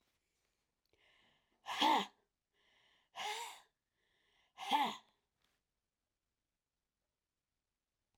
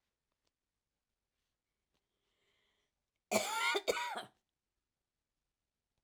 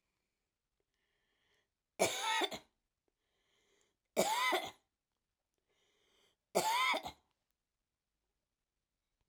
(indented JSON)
{
  "exhalation_length": "8.2 s",
  "exhalation_amplitude": 3079,
  "exhalation_signal_mean_std_ratio": 0.26,
  "cough_length": "6.0 s",
  "cough_amplitude": 3886,
  "cough_signal_mean_std_ratio": 0.28,
  "three_cough_length": "9.3 s",
  "three_cough_amplitude": 4307,
  "three_cough_signal_mean_std_ratio": 0.32,
  "survey_phase": "alpha (2021-03-01 to 2021-08-12)",
  "age": "45-64",
  "gender": "Female",
  "wearing_mask": "No",
  "symptom_none": true,
  "smoker_status": "Never smoked",
  "respiratory_condition_asthma": false,
  "respiratory_condition_other": false,
  "recruitment_source": "REACT",
  "submission_delay": "3 days",
  "covid_test_result": "Negative",
  "covid_test_method": "RT-qPCR"
}